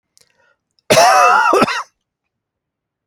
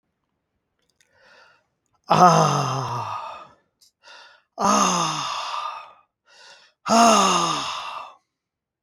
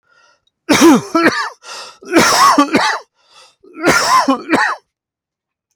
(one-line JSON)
{"cough_length": "3.1 s", "cough_amplitude": 32768, "cough_signal_mean_std_ratio": 0.46, "exhalation_length": "8.8 s", "exhalation_amplitude": 32753, "exhalation_signal_mean_std_ratio": 0.46, "three_cough_length": "5.8 s", "three_cough_amplitude": 32768, "three_cough_signal_mean_std_ratio": 0.56, "survey_phase": "beta (2021-08-13 to 2022-03-07)", "age": "65+", "gender": "Male", "wearing_mask": "No", "symptom_cough_any": true, "symptom_runny_or_blocked_nose": true, "symptom_onset": "3 days", "smoker_status": "Never smoked", "respiratory_condition_asthma": false, "respiratory_condition_other": false, "recruitment_source": "REACT", "submission_delay": "1 day", "covid_test_result": "Positive", "covid_test_method": "RT-qPCR", "covid_ct_value": 20.7, "covid_ct_gene": "E gene", "influenza_a_test_result": "Negative", "influenza_b_test_result": "Negative"}